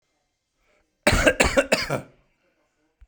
{"cough_length": "3.1 s", "cough_amplitude": 26818, "cough_signal_mean_std_ratio": 0.36, "survey_phase": "beta (2021-08-13 to 2022-03-07)", "age": "45-64", "gender": "Male", "wearing_mask": "No", "symptom_none": true, "smoker_status": "Never smoked", "respiratory_condition_asthma": false, "respiratory_condition_other": false, "recruitment_source": "REACT", "submission_delay": "4 days", "covid_test_result": "Negative", "covid_test_method": "RT-qPCR"}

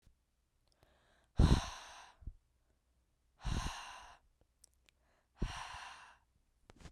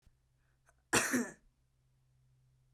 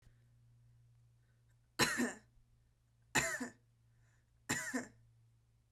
{"exhalation_length": "6.9 s", "exhalation_amplitude": 4896, "exhalation_signal_mean_std_ratio": 0.27, "cough_length": "2.7 s", "cough_amplitude": 8155, "cough_signal_mean_std_ratio": 0.29, "three_cough_length": "5.7 s", "three_cough_amplitude": 5362, "three_cough_signal_mean_std_ratio": 0.34, "survey_phase": "beta (2021-08-13 to 2022-03-07)", "age": "18-44", "gender": "Female", "wearing_mask": "No", "symptom_runny_or_blocked_nose": true, "symptom_sore_throat": true, "symptom_other": true, "smoker_status": "Ex-smoker", "respiratory_condition_asthma": false, "respiratory_condition_other": false, "recruitment_source": "Test and Trace", "submission_delay": "1 day", "covid_test_result": "Positive", "covid_test_method": "LFT"}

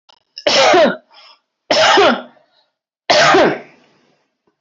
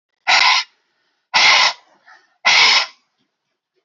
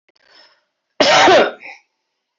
{"three_cough_length": "4.6 s", "three_cough_amplitude": 29358, "three_cough_signal_mean_std_ratio": 0.52, "exhalation_length": "3.8 s", "exhalation_amplitude": 30931, "exhalation_signal_mean_std_ratio": 0.47, "cough_length": "2.4 s", "cough_amplitude": 27875, "cough_signal_mean_std_ratio": 0.42, "survey_phase": "alpha (2021-03-01 to 2021-08-12)", "age": "45-64", "gender": "Female", "wearing_mask": "No", "symptom_prefer_not_to_say": true, "symptom_onset": "2 days", "smoker_status": "Ex-smoker", "respiratory_condition_asthma": false, "respiratory_condition_other": false, "recruitment_source": "Test and Trace", "submission_delay": "1 day", "covid_test_result": "Positive", "covid_test_method": "RT-qPCR"}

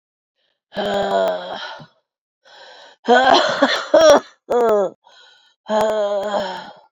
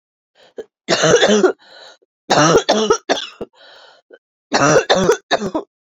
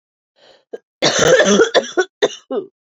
{"exhalation_length": "6.9 s", "exhalation_amplitude": 28944, "exhalation_signal_mean_std_ratio": 0.55, "three_cough_length": "6.0 s", "three_cough_amplitude": 29760, "three_cough_signal_mean_std_ratio": 0.51, "cough_length": "2.8 s", "cough_amplitude": 30292, "cough_signal_mean_std_ratio": 0.51, "survey_phase": "beta (2021-08-13 to 2022-03-07)", "age": "45-64", "gender": "Female", "wearing_mask": "Yes", "symptom_cough_any": true, "symptom_new_continuous_cough": true, "symptom_runny_or_blocked_nose": true, "symptom_shortness_of_breath": true, "symptom_fatigue": true, "symptom_fever_high_temperature": true, "symptom_headache": true, "symptom_onset": "3 days", "smoker_status": "Ex-smoker", "respiratory_condition_asthma": true, "respiratory_condition_other": false, "recruitment_source": "Test and Trace", "submission_delay": "2 days", "covid_test_result": "Positive", "covid_test_method": "LAMP"}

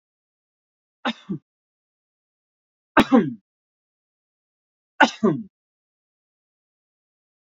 {"three_cough_length": "7.4 s", "three_cough_amplitude": 32253, "three_cough_signal_mean_std_ratio": 0.21, "survey_phase": "beta (2021-08-13 to 2022-03-07)", "age": "18-44", "gender": "Male", "wearing_mask": "No", "symptom_none": true, "smoker_status": "Current smoker (e-cigarettes or vapes only)", "respiratory_condition_asthma": false, "respiratory_condition_other": false, "recruitment_source": "REACT", "submission_delay": "2 days", "covid_test_result": "Negative", "covid_test_method": "RT-qPCR", "influenza_a_test_result": "Negative", "influenza_b_test_result": "Negative"}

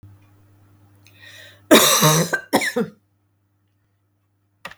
{"cough_length": "4.8 s", "cough_amplitude": 32768, "cough_signal_mean_std_ratio": 0.34, "survey_phase": "beta (2021-08-13 to 2022-03-07)", "age": "45-64", "gender": "Female", "wearing_mask": "No", "symptom_fatigue": true, "smoker_status": "Ex-smoker", "respiratory_condition_asthma": false, "respiratory_condition_other": false, "recruitment_source": "Test and Trace", "submission_delay": "2 days", "covid_test_result": "Positive", "covid_test_method": "RT-qPCR", "covid_ct_value": 33.0, "covid_ct_gene": "ORF1ab gene", "covid_ct_mean": 33.8, "covid_viral_load": "8.3 copies/ml", "covid_viral_load_category": "Minimal viral load (< 10K copies/ml)"}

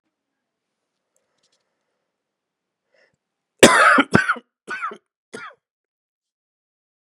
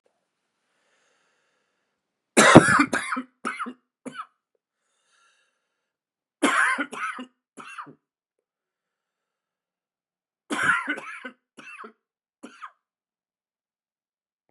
{"cough_length": "7.1 s", "cough_amplitude": 32768, "cough_signal_mean_std_ratio": 0.23, "three_cough_length": "14.5 s", "three_cough_amplitude": 32768, "three_cough_signal_mean_std_ratio": 0.24, "survey_phase": "beta (2021-08-13 to 2022-03-07)", "age": "18-44", "gender": "Male", "wearing_mask": "No", "symptom_cough_any": true, "symptom_runny_or_blocked_nose": true, "symptom_fatigue": true, "symptom_fever_high_temperature": true, "symptom_headache": true, "symptom_other": true, "smoker_status": "Never smoked", "respiratory_condition_asthma": false, "respiratory_condition_other": false, "recruitment_source": "Test and Trace", "submission_delay": "2 days", "covid_test_result": "Positive", "covid_test_method": "RT-qPCR", "covid_ct_value": 16.3, "covid_ct_gene": "ORF1ab gene", "covid_ct_mean": 16.7, "covid_viral_load": "3200000 copies/ml", "covid_viral_load_category": "High viral load (>1M copies/ml)"}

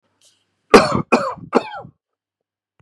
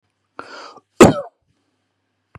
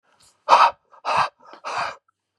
{"three_cough_length": "2.8 s", "three_cough_amplitude": 32768, "three_cough_signal_mean_std_ratio": 0.3, "cough_length": "2.4 s", "cough_amplitude": 32768, "cough_signal_mean_std_ratio": 0.21, "exhalation_length": "2.4 s", "exhalation_amplitude": 31725, "exhalation_signal_mean_std_ratio": 0.38, "survey_phase": "beta (2021-08-13 to 2022-03-07)", "age": "45-64", "gender": "Male", "wearing_mask": "No", "symptom_none": true, "symptom_onset": "12 days", "smoker_status": "Ex-smoker", "respiratory_condition_asthma": true, "respiratory_condition_other": false, "recruitment_source": "REACT", "submission_delay": "1 day", "covid_test_result": "Negative", "covid_test_method": "RT-qPCR", "influenza_a_test_result": "Positive", "influenza_a_ct_value": 31.9, "influenza_b_test_result": "Positive", "influenza_b_ct_value": 31.8}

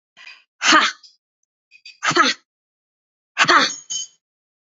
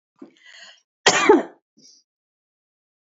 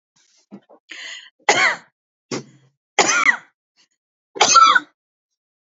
{"exhalation_length": "4.6 s", "exhalation_amplitude": 29871, "exhalation_signal_mean_std_ratio": 0.37, "cough_length": "3.2 s", "cough_amplitude": 29133, "cough_signal_mean_std_ratio": 0.26, "three_cough_length": "5.7 s", "three_cough_amplitude": 30975, "three_cough_signal_mean_std_ratio": 0.35, "survey_phase": "beta (2021-08-13 to 2022-03-07)", "age": "45-64", "gender": "Female", "wearing_mask": "No", "symptom_none": true, "smoker_status": "Never smoked", "respiratory_condition_asthma": false, "respiratory_condition_other": false, "recruitment_source": "REACT", "submission_delay": "2 days", "covid_test_result": "Negative", "covid_test_method": "RT-qPCR"}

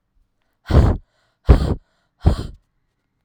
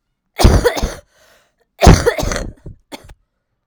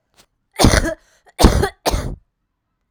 {"exhalation_length": "3.2 s", "exhalation_amplitude": 32768, "exhalation_signal_mean_std_ratio": 0.34, "cough_length": "3.7 s", "cough_amplitude": 32768, "cough_signal_mean_std_ratio": 0.38, "three_cough_length": "2.9 s", "three_cough_amplitude": 32768, "three_cough_signal_mean_std_ratio": 0.4, "survey_phase": "alpha (2021-03-01 to 2021-08-12)", "age": "18-44", "gender": "Female", "wearing_mask": "No", "symptom_cough_any": true, "symptom_new_continuous_cough": true, "symptom_shortness_of_breath": true, "symptom_diarrhoea": true, "symptom_fatigue": true, "symptom_fever_high_temperature": true, "symptom_headache": true, "symptom_onset": "9 days", "smoker_status": "Never smoked", "respiratory_condition_asthma": true, "respiratory_condition_other": false, "recruitment_source": "Test and Trace", "submission_delay": "2 days", "covid_test_result": "Positive", "covid_test_method": "RT-qPCR", "covid_ct_value": 21.8, "covid_ct_gene": "ORF1ab gene"}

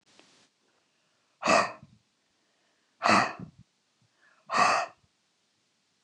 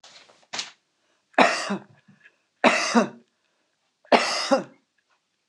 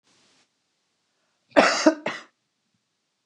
{"exhalation_length": "6.0 s", "exhalation_amplitude": 14709, "exhalation_signal_mean_std_ratio": 0.31, "three_cough_length": "5.5 s", "three_cough_amplitude": 25799, "three_cough_signal_mean_std_ratio": 0.35, "cough_length": "3.3 s", "cough_amplitude": 26028, "cough_signal_mean_std_ratio": 0.26, "survey_phase": "beta (2021-08-13 to 2022-03-07)", "age": "65+", "gender": "Female", "wearing_mask": "No", "symptom_none": true, "smoker_status": "Ex-smoker", "respiratory_condition_asthma": false, "respiratory_condition_other": false, "recruitment_source": "REACT", "submission_delay": "0 days", "covid_test_result": "Negative", "covid_test_method": "RT-qPCR"}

